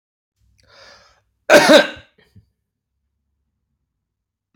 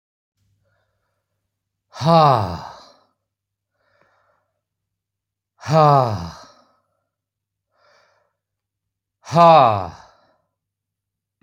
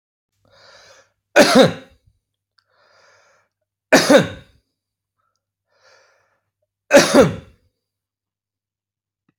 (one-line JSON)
{"cough_length": "4.6 s", "cough_amplitude": 31402, "cough_signal_mean_std_ratio": 0.23, "exhalation_length": "11.4 s", "exhalation_amplitude": 29521, "exhalation_signal_mean_std_ratio": 0.29, "three_cough_length": "9.4 s", "three_cough_amplitude": 32768, "three_cough_signal_mean_std_ratio": 0.26, "survey_phase": "alpha (2021-03-01 to 2021-08-12)", "age": "45-64", "gender": "Male", "wearing_mask": "No", "symptom_none": true, "smoker_status": "Never smoked", "respiratory_condition_asthma": false, "respiratory_condition_other": false, "recruitment_source": "REACT", "submission_delay": "7 days", "covid_test_result": "Negative", "covid_test_method": "RT-qPCR"}